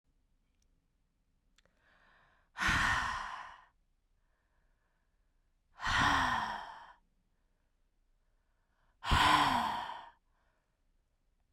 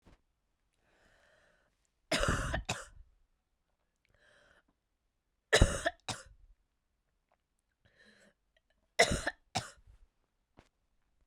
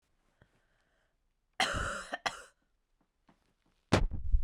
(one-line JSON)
{"exhalation_length": "11.5 s", "exhalation_amplitude": 6433, "exhalation_signal_mean_std_ratio": 0.37, "three_cough_length": "11.3 s", "three_cough_amplitude": 9271, "three_cough_signal_mean_std_ratio": 0.24, "cough_length": "4.4 s", "cough_amplitude": 13181, "cough_signal_mean_std_ratio": 0.35, "survey_phase": "beta (2021-08-13 to 2022-03-07)", "age": "45-64", "gender": "Female", "wearing_mask": "No", "symptom_cough_any": true, "symptom_runny_or_blocked_nose": true, "symptom_fatigue": true, "symptom_fever_high_temperature": true, "symptom_onset": "7 days", "smoker_status": "Never smoked", "respiratory_condition_asthma": false, "respiratory_condition_other": false, "recruitment_source": "Test and Trace", "submission_delay": "1 day", "covid_test_result": "Positive", "covid_test_method": "RT-qPCR", "covid_ct_value": 18.8, "covid_ct_gene": "ORF1ab gene", "covid_ct_mean": 19.4, "covid_viral_load": "420000 copies/ml", "covid_viral_load_category": "Low viral load (10K-1M copies/ml)"}